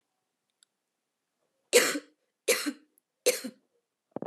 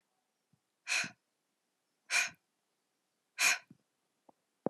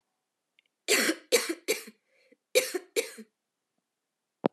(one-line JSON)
{"three_cough_length": "4.3 s", "three_cough_amplitude": 15297, "three_cough_signal_mean_std_ratio": 0.28, "exhalation_length": "4.7 s", "exhalation_amplitude": 5229, "exhalation_signal_mean_std_ratio": 0.27, "cough_length": "4.5 s", "cough_amplitude": 13327, "cough_signal_mean_std_ratio": 0.33, "survey_phase": "alpha (2021-03-01 to 2021-08-12)", "age": "18-44", "gender": "Female", "wearing_mask": "No", "symptom_fatigue": true, "symptom_change_to_sense_of_smell_or_taste": true, "symptom_onset": "3 days", "smoker_status": "Never smoked", "respiratory_condition_asthma": false, "respiratory_condition_other": false, "recruitment_source": "Test and Trace", "submission_delay": "1 day", "covid_test_result": "Positive", "covid_test_method": "ePCR"}